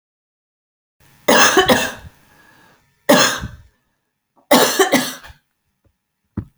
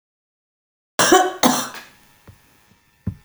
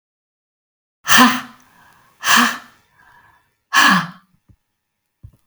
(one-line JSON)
{"three_cough_length": "6.6 s", "three_cough_amplitude": 32768, "three_cough_signal_mean_std_ratio": 0.38, "cough_length": "3.2 s", "cough_amplitude": 32768, "cough_signal_mean_std_ratio": 0.34, "exhalation_length": "5.5 s", "exhalation_amplitude": 32768, "exhalation_signal_mean_std_ratio": 0.33, "survey_phase": "beta (2021-08-13 to 2022-03-07)", "age": "65+", "gender": "Female", "wearing_mask": "No", "symptom_none": true, "smoker_status": "Never smoked", "respiratory_condition_asthma": false, "respiratory_condition_other": false, "recruitment_source": "Test and Trace", "submission_delay": "0 days", "covid_test_result": "Negative", "covid_test_method": "LFT"}